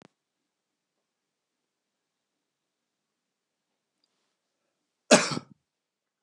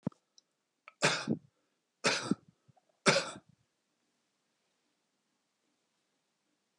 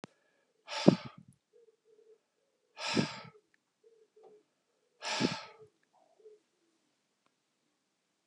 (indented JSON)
{
  "cough_length": "6.2 s",
  "cough_amplitude": 23519,
  "cough_signal_mean_std_ratio": 0.12,
  "three_cough_length": "6.8 s",
  "three_cough_amplitude": 11372,
  "three_cough_signal_mean_std_ratio": 0.25,
  "exhalation_length": "8.3 s",
  "exhalation_amplitude": 17869,
  "exhalation_signal_mean_std_ratio": 0.21,
  "survey_phase": "beta (2021-08-13 to 2022-03-07)",
  "age": "65+",
  "gender": "Male",
  "wearing_mask": "No",
  "symptom_none": true,
  "smoker_status": "Never smoked",
  "respiratory_condition_asthma": false,
  "respiratory_condition_other": false,
  "recruitment_source": "REACT",
  "submission_delay": "2 days",
  "covid_test_result": "Negative",
  "covid_test_method": "RT-qPCR"
}